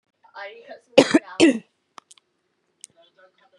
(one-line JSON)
{"three_cough_length": "3.6 s", "three_cough_amplitude": 32740, "three_cough_signal_mean_std_ratio": 0.25, "survey_phase": "beta (2021-08-13 to 2022-03-07)", "age": "18-44", "gender": "Female", "wearing_mask": "No", "symptom_cough_any": true, "symptom_runny_or_blocked_nose": true, "symptom_fatigue": true, "smoker_status": "Current smoker (1 to 10 cigarettes per day)", "respiratory_condition_asthma": false, "respiratory_condition_other": false, "recruitment_source": "Test and Trace", "submission_delay": "2 days", "covid_test_result": "Positive", "covid_test_method": "LFT"}